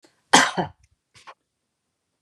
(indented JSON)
{
  "cough_length": "2.2 s",
  "cough_amplitude": 31925,
  "cough_signal_mean_std_ratio": 0.25,
  "survey_phase": "beta (2021-08-13 to 2022-03-07)",
  "age": "65+",
  "gender": "Female",
  "wearing_mask": "No",
  "symptom_none": true,
  "smoker_status": "Ex-smoker",
  "respiratory_condition_asthma": false,
  "respiratory_condition_other": true,
  "recruitment_source": "REACT",
  "submission_delay": "1 day",
  "covid_test_result": "Negative",
  "covid_test_method": "RT-qPCR",
  "influenza_a_test_result": "Negative",
  "influenza_b_test_result": "Negative"
}